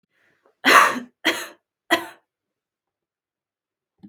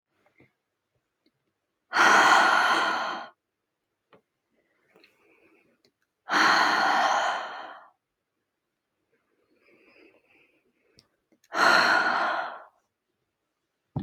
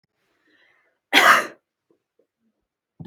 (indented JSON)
{
  "three_cough_length": "4.1 s",
  "three_cough_amplitude": 32767,
  "three_cough_signal_mean_std_ratio": 0.27,
  "exhalation_length": "14.0 s",
  "exhalation_amplitude": 17648,
  "exhalation_signal_mean_std_ratio": 0.41,
  "cough_length": "3.1 s",
  "cough_amplitude": 32514,
  "cough_signal_mean_std_ratio": 0.25,
  "survey_phase": "beta (2021-08-13 to 2022-03-07)",
  "age": "18-44",
  "gender": "Female",
  "wearing_mask": "Yes",
  "symptom_headache": true,
  "smoker_status": "Never smoked",
  "respiratory_condition_asthma": false,
  "respiratory_condition_other": false,
  "recruitment_source": "REACT",
  "submission_delay": "1 day",
  "covid_test_result": "Negative",
  "covid_test_method": "RT-qPCR",
  "influenza_a_test_result": "Negative",
  "influenza_b_test_result": "Negative"
}